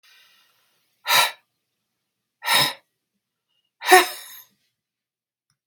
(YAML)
exhalation_length: 5.7 s
exhalation_amplitude: 32768
exhalation_signal_mean_std_ratio: 0.26
survey_phase: beta (2021-08-13 to 2022-03-07)
age: 45-64
gender: Female
wearing_mask: 'No'
symptom_runny_or_blocked_nose: true
symptom_onset: 12 days
smoker_status: Ex-smoker
respiratory_condition_asthma: false
respiratory_condition_other: false
recruitment_source: REACT
submission_delay: 1 day
covid_test_result: Negative
covid_test_method: RT-qPCR
influenza_a_test_result: Negative
influenza_b_test_result: Negative